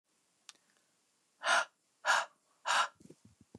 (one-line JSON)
{"exhalation_length": "3.6 s", "exhalation_amplitude": 5610, "exhalation_signal_mean_std_ratio": 0.34, "survey_phase": "beta (2021-08-13 to 2022-03-07)", "age": "18-44", "gender": "Female", "wearing_mask": "No", "symptom_none": true, "smoker_status": "Never smoked", "respiratory_condition_asthma": false, "respiratory_condition_other": false, "recruitment_source": "REACT", "submission_delay": "2 days", "covid_test_result": "Negative", "covid_test_method": "RT-qPCR", "influenza_a_test_result": "Negative", "influenza_b_test_result": "Negative"}